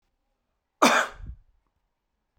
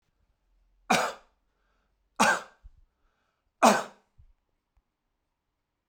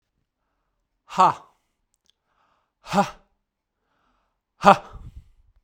{
  "cough_length": "2.4 s",
  "cough_amplitude": 20613,
  "cough_signal_mean_std_ratio": 0.27,
  "three_cough_length": "5.9 s",
  "three_cough_amplitude": 19742,
  "three_cough_signal_mean_std_ratio": 0.24,
  "exhalation_length": "5.6 s",
  "exhalation_amplitude": 32768,
  "exhalation_signal_mean_std_ratio": 0.21,
  "survey_phase": "beta (2021-08-13 to 2022-03-07)",
  "age": "45-64",
  "gender": "Male",
  "wearing_mask": "No",
  "symptom_none": true,
  "smoker_status": "Never smoked",
  "respiratory_condition_asthma": false,
  "respiratory_condition_other": false,
  "recruitment_source": "REACT",
  "submission_delay": "1 day",
  "covid_test_result": "Negative",
  "covid_test_method": "RT-qPCR"
}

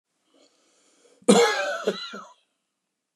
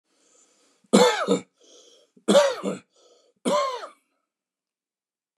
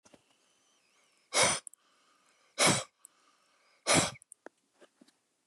{
  "cough_length": "3.2 s",
  "cough_amplitude": 24808,
  "cough_signal_mean_std_ratio": 0.34,
  "three_cough_length": "5.4 s",
  "three_cough_amplitude": 26593,
  "three_cough_signal_mean_std_ratio": 0.35,
  "exhalation_length": "5.5 s",
  "exhalation_amplitude": 8210,
  "exhalation_signal_mean_std_ratio": 0.29,
  "survey_phase": "beta (2021-08-13 to 2022-03-07)",
  "age": "45-64",
  "gender": "Male",
  "wearing_mask": "No",
  "symptom_none": true,
  "smoker_status": "Ex-smoker",
  "respiratory_condition_asthma": false,
  "respiratory_condition_other": false,
  "recruitment_source": "REACT",
  "submission_delay": "1 day",
  "covid_test_result": "Negative",
  "covid_test_method": "RT-qPCR",
  "influenza_a_test_result": "Negative",
  "influenza_b_test_result": "Negative"
}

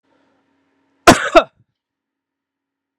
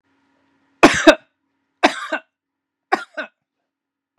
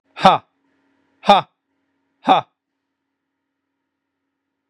{
  "cough_length": "3.0 s",
  "cough_amplitude": 32768,
  "cough_signal_mean_std_ratio": 0.21,
  "three_cough_length": "4.2 s",
  "three_cough_amplitude": 32768,
  "three_cough_signal_mean_std_ratio": 0.24,
  "exhalation_length": "4.7 s",
  "exhalation_amplitude": 32768,
  "exhalation_signal_mean_std_ratio": 0.22,
  "survey_phase": "beta (2021-08-13 to 2022-03-07)",
  "age": "45-64",
  "gender": "Male",
  "wearing_mask": "No",
  "symptom_none": true,
  "smoker_status": "Never smoked",
  "respiratory_condition_asthma": false,
  "respiratory_condition_other": false,
  "recruitment_source": "REACT",
  "submission_delay": "2 days",
  "covid_test_result": "Negative",
  "covid_test_method": "RT-qPCR",
  "influenza_a_test_result": "Negative",
  "influenza_b_test_result": "Negative"
}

